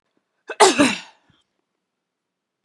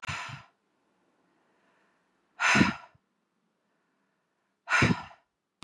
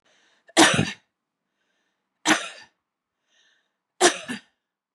{"cough_length": "2.6 s", "cough_amplitude": 32566, "cough_signal_mean_std_ratio": 0.27, "exhalation_length": "5.6 s", "exhalation_amplitude": 11000, "exhalation_signal_mean_std_ratio": 0.29, "three_cough_length": "4.9 s", "three_cough_amplitude": 26124, "three_cough_signal_mean_std_ratio": 0.28, "survey_phase": "beta (2021-08-13 to 2022-03-07)", "age": "45-64", "gender": "Female", "wearing_mask": "No", "symptom_none": true, "smoker_status": "Ex-smoker", "respiratory_condition_asthma": false, "respiratory_condition_other": false, "recruitment_source": "REACT", "submission_delay": "2 days", "covid_test_result": "Negative", "covid_test_method": "RT-qPCR", "covid_ct_value": 45.0, "covid_ct_gene": "E gene"}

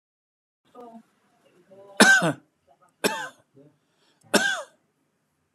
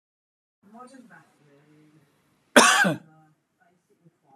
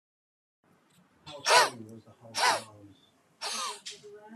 {"three_cough_length": "5.5 s", "three_cough_amplitude": 27737, "three_cough_signal_mean_std_ratio": 0.28, "cough_length": "4.4 s", "cough_amplitude": 31163, "cough_signal_mean_std_ratio": 0.24, "exhalation_length": "4.4 s", "exhalation_amplitude": 14715, "exhalation_signal_mean_std_ratio": 0.35, "survey_phase": "beta (2021-08-13 to 2022-03-07)", "age": "45-64", "gender": "Male", "wearing_mask": "No", "symptom_none": true, "smoker_status": "Never smoked", "respiratory_condition_asthma": false, "respiratory_condition_other": false, "recruitment_source": "REACT", "submission_delay": "1 day", "covid_test_result": "Negative", "covid_test_method": "RT-qPCR"}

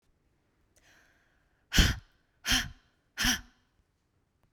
{"exhalation_length": "4.5 s", "exhalation_amplitude": 13968, "exhalation_signal_mean_std_ratio": 0.28, "survey_phase": "beta (2021-08-13 to 2022-03-07)", "age": "45-64", "gender": "Female", "wearing_mask": "No", "symptom_none": true, "smoker_status": "Never smoked", "respiratory_condition_asthma": false, "respiratory_condition_other": false, "recruitment_source": "REACT", "submission_delay": "1 day", "covid_test_result": "Negative", "covid_test_method": "RT-qPCR"}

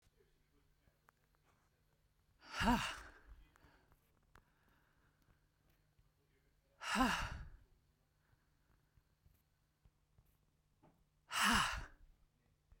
{"exhalation_length": "12.8 s", "exhalation_amplitude": 3196, "exhalation_signal_mean_std_ratio": 0.28, "survey_phase": "beta (2021-08-13 to 2022-03-07)", "age": "18-44", "gender": "Female", "wearing_mask": "No", "symptom_shortness_of_breath": true, "symptom_fatigue": true, "smoker_status": "Ex-smoker", "respiratory_condition_asthma": false, "respiratory_condition_other": false, "recruitment_source": "REACT", "submission_delay": "3 days", "covid_test_result": "Negative", "covid_test_method": "RT-qPCR", "influenza_a_test_result": "Negative", "influenza_b_test_result": "Negative"}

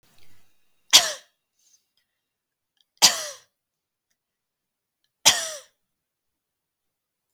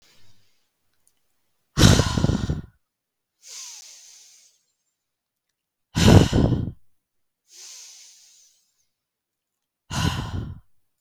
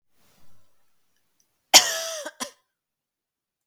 {"three_cough_length": "7.3 s", "three_cough_amplitude": 32768, "three_cough_signal_mean_std_ratio": 0.19, "exhalation_length": "11.0 s", "exhalation_amplitude": 32766, "exhalation_signal_mean_std_ratio": 0.3, "cough_length": "3.7 s", "cough_amplitude": 32768, "cough_signal_mean_std_ratio": 0.21, "survey_phase": "beta (2021-08-13 to 2022-03-07)", "age": "18-44", "gender": "Female", "wearing_mask": "No", "symptom_runny_or_blocked_nose": true, "symptom_sore_throat": true, "symptom_fatigue": true, "symptom_headache": true, "symptom_onset": "7 days", "smoker_status": "Never smoked", "respiratory_condition_asthma": false, "respiratory_condition_other": false, "recruitment_source": "Test and Trace", "submission_delay": "2 days", "covid_test_result": "Positive", "covid_test_method": "RT-qPCR", "covid_ct_value": 21.7, "covid_ct_gene": "ORF1ab gene", "covid_ct_mean": 22.5, "covid_viral_load": "41000 copies/ml", "covid_viral_load_category": "Low viral load (10K-1M copies/ml)"}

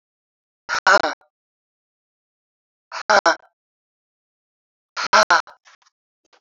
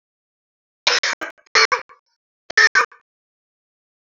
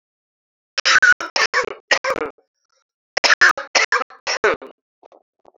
{"exhalation_length": "6.4 s", "exhalation_amplitude": 28201, "exhalation_signal_mean_std_ratio": 0.26, "three_cough_length": "4.1 s", "three_cough_amplitude": 29170, "three_cough_signal_mean_std_ratio": 0.3, "cough_length": "5.6 s", "cough_amplitude": 29946, "cough_signal_mean_std_ratio": 0.4, "survey_phase": "beta (2021-08-13 to 2022-03-07)", "age": "45-64", "gender": "Female", "wearing_mask": "No", "symptom_cough_any": true, "symptom_runny_or_blocked_nose": true, "symptom_headache": true, "symptom_change_to_sense_of_smell_or_taste": true, "symptom_onset": "6 days", "smoker_status": "Current smoker (1 to 10 cigarettes per day)", "respiratory_condition_asthma": false, "respiratory_condition_other": false, "recruitment_source": "Test and Trace", "submission_delay": "2 days", "covid_test_result": "Positive", "covid_test_method": "RT-qPCR", "covid_ct_value": 19.6, "covid_ct_gene": "ORF1ab gene", "covid_ct_mean": 19.9, "covid_viral_load": "290000 copies/ml", "covid_viral_load_category": "Low viral load (10K-1M copies/ml)"}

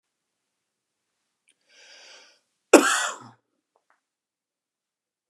{"cough_length": "5.3 s", "cough_amplitude": 32764, "cough_signal_mean_std_ratio": 0.17, "survey_phase": "beta (2021-08-13 to 2022-03-07)", "age": "45-64", "gender": "Male", "wearing_mask": "No", "symptom_none": true, "smoker_status": "Never smoked", "respiratory_condition_asthma": false, "respiratory_condition_other": false, "recruitment_source": "REACT", "submission_delay": "1 day", "covid_test_result": "Negative", "covid_test_method": "RT-qPCR", "influenza_a_test_result": "Negative", "influenza_b_test_result": "Negative"}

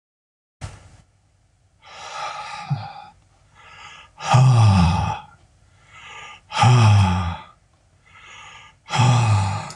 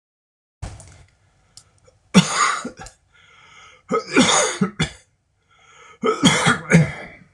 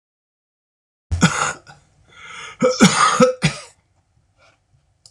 {"exhalation_length": "9.8 s", "exhalation_amplitude": 22223, "exhalation_signal_mean_std_ratio": 0.49, "three_cough_length": "7.3 s", "three_cough_amplitude": 26028, "three_cough_signal_mean_std_ratio": 0.41, "cough_length": "5.1 s", "cough_amplitude": 26028, "cough_signal_mean_std_ratio": 0.38, "survey_phase": "beta (2021-08-13 to 2022-03-07)", "age": "65+", "gender": "Male", "wearing_mask": "No", "symptom_headache": true, "smoker_status": "Ex-smoker", "respiratory_condition_asthma": false, "respiratory_condition_other": false, "recruitment_source": "REACT", "submission_delay": "2 days", "covid_test_result": "Negative", "covid_test_method": "RT-qPCR"}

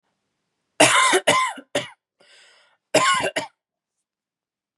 {"cough_length": "4.8 s", "cough_amplitude": 30181, "cough_signal_mean_std_ratio": 0.39, "survey_phase": "beta (2021-08-13 to 2022-03-07)", "age": "18-44", "gender": "Female", "wearing_mask": "No", "symptom_none": true, "smoker_status": "Never smoked", "respiratory_condition_asthma": false, "respiratory_condition_other": false, "recruitment_source": "REACT", "submission_delay": "2 days", "covid_test_result": "Negative", "covid_test_method": "RT-qPCR", "influenza_a_test_result": "Negative", "influenza_b_test_result": "Negative"}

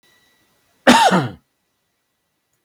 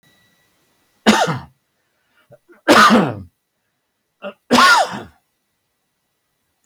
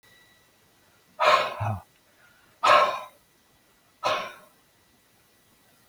{"cough_length": "2.6 s", "cough_amplitude": 32768, "cough_signal_mean_std_ratio": 0.31, "three_cough_length": "6.7 s", "three_cough_amplitude": 32768, "three_cough_signal_mean_std_ratio": 0.35, "exhalation_length": "5.9 s", "exhalation_amplitude": 18527, "exhalation_signal_mean_std_ratio": 0.33, "survey_phase": "beta (2021-08-13 to 2022-03-07)", "age": "65+", "gender": "Male", "wearing_mask": "No", "symptom_cough_any": true, "smoker_status": "Never smoked", "respiratory_condition_asthma": false, "respiratory_condition_other": false, "recruitment_source": "Test and Trace", "submission_delay": "2 days", "covid_test_result": "Negative", "covid_test_method": "RT-qPCR"}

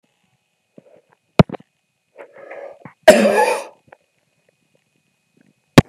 {"cough_length": "5.9 s", "cough_amplitude": 32768, "cough_signal_mean_std_ratio": 0.23, "survey_phase": "beta (2021-08-13 to 2022-03-07)", "age": "65+", "gender": "Male", "wearing_mask": "No", "symptom_cough_any": true, "symptom_runny_or_blocked_nose": true, "symptom_diarrhoea": true, "symptom_fatigue": true, "symptom_change_to_sense_of_smell_or_taste": true, "symptom_onset": "1 day", "smoker_status": "Ex-smoker", "respiratory_condition_asthma": false, "respiratory_condition_other": false, "recruitment_source": "Test and Trace", "submission_delay": "-1 day", "covid_test_result": "Positive", "covid_test_method": "RT-qPCR", "covid_ct_value": 11.2, "covid_ct_gene": "N gene", "covid_ct_mean": 11.8, "covid_viral_load": "130000000 copies/ml", "covid_viral_load_category": "High viral load (>1M copies/ml)"}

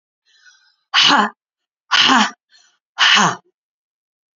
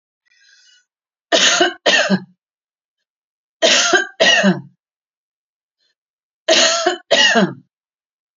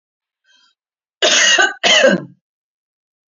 {"exhalation_length": "4.4 s", "exhalation_amplitude": 30415, "exhalation_signal_mean_std_ratio": 0.41, "three_cough_length": "8.4 s", "three_cough_amplitude": 32768, "three_cough_signal_mean_std_ratio": 0.45, "cough_length": "3.3 s", "cough_amplitude": 31401, "cough_signal_mean_std_ratio": 0.43, "survey_phase": "beta (2021-08-13 to 2022-03-07)", "age": "45-64", "gender": "Female", "wearing_mask": "No", "symptom_none": true, "smoker_status": "Ex-smoker", "respiratory_condition_asthma": false, "respiratory_condition_other": false, "recruitment_source": "Test and Trace", "submission_delay": "0 days", "covid_test_result": "Negative", "covid_test_method": "RT-qPCR"}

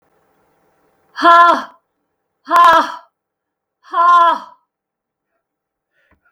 {"exhalation_length": "6.3 s", "exhalation_amplitude": 32768, "exhalation_signal_mean_std_ratio": 0.39, "survey_phase": "beta (2021-08-13 to 2022-03-07)", "age": "65+", "gender": "Female", "wearing_mask": "No", "symptom_none": true, "smoker_status": "Never smoked", "respiratory_condition_asthma": false, "respiratory_condition_other": false, "recruitment_source": "REACT", "submission_delay": "2 days", "covid_test_result": "Negative", "covid_test_method": "RT-qPCR", "influenza_a_test_result": "Negative", "influenza_b_test_result": "Negative"}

